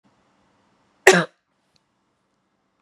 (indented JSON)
{
  "cough_length": "2.8 s",
  "cough_amplitude": 32768,
  "cough_signal_mean_std_ratio": 0.18,
  "survey_phase": "beta (2021-08-13 to 2022-03-07)",
  "age": "45-64",
  "gender": "Female",
  "wearing_mask": "No",
  "symptom_fatigue": true,
  "symptom_headache": true,
  "symptom_change_to_sense_of_smell_or_taste": true,
  "symptom_onset": "5 days",
  "smoker_status": "Never smoked",
  "respiratory_condition_asthma": false,
  "respiratory_condition_other": false,
  "recruitment_source": "Test and Trace",
  "submission_delay": "2 days",
  "covid_test_result": "Positive",
  "covid_test_method": "RT-qPCR"
}